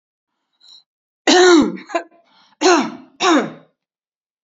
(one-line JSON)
{"cough_length": "4.4 s", "cough_amplitude": 32418, "cough_signal_mean_std_ratio": 0.41, "survey_phase": "beta (2021-08-13 to 2022-03-07)", "age": "65+", "gender": "Female", "wearing_mask": "No", "symptom_sore_throat": true, "symptom_onset": "6 days", "smoker_status": "Never smoked", "respiratory_condition_asthma": false, "respiratory_condition_other": false, "recruitment_source": "REACT", "submission_delay": "3 days", "covid_test_result": "Negative", "covid_test_method": "RT-qPCR"}